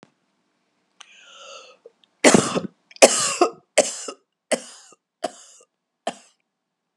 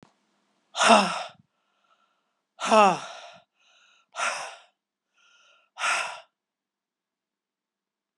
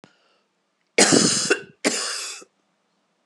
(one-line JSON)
{"three_cough_length": "7.0 s", "three_cough_amplitude": 32768, "three_cough_signal_mean_std_ratio": 0.27, "exhalation_length": "8.2 s", "exhalation_amplitude": 24699, "exhalation_signal_mean_std_ratio": 0.28, "cough_length": "3.3 s", "cough_amplitude": 29796, "cough_signal_mean_std_ratio": 0.41, "survey_phase": "beta (2021-08-13 to 2022-03-07)", "age": "65+", "gender": "Female", "wearing_mask": "No", "symptom_none": true, "smoker_status": "Ex-smoker", "respiratory_condition_asthma": false, "respiratory_condition_other": false, "recruitment_source": "REACT", "submission_delay": "1 day", "covid_test_result": "Negative", "covid_test_method": "RT-qPCR", "influenza_a_test_result": "Negative", "influenza_b_test_result": "Negative"}